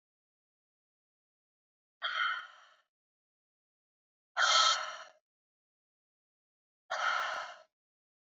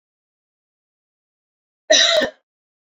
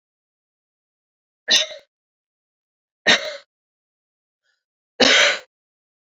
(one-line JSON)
{"exhalation_length": "8.3 s", "exhalation_amplitude": 6675, "exhalation_signal_mean_std_ratio": 0.32, "cough_length": "2.8 s", "cough_amplitude": 29317, "cough_signal_mean_std_ratio": 0.3, "three_cough_length": "6.1 s", "three_cough_amplitude": 30076, "three_cough_signal_mean_std_ratio": 0.27, "survey_phase": "beta (2021-08-13 to 2022-03-07)", "age": "18-44", "gender": "Female", "wearing_mask": "No", "symptom_cough_any": true, "symptom_new_continuous_cough": true, "symptom_fatigue": true, "symptom_change_to_sense_of_smell_or_taste": true, "symptom_loss_of_taste": true, "symptom_onset": "5 days", "smoker_status": "Ex-smoker", "respiratory_condition_asthma": true, "respiratory_condition_other": false, "recruitment_source": "Test and Trace", "submission_delay": "2 days", "covid_test_result": "Positive", "covid_test_method": "RT-qPCR", "covid_ct_value": 17.8, "covid_ct_gene": "ORF1ab gene", "covid_ct_mean": 18.3, "covid_viral_load": "1000000 copies/ml", "covid_viral_load_category": "High viral load (>1M copies/ml)"}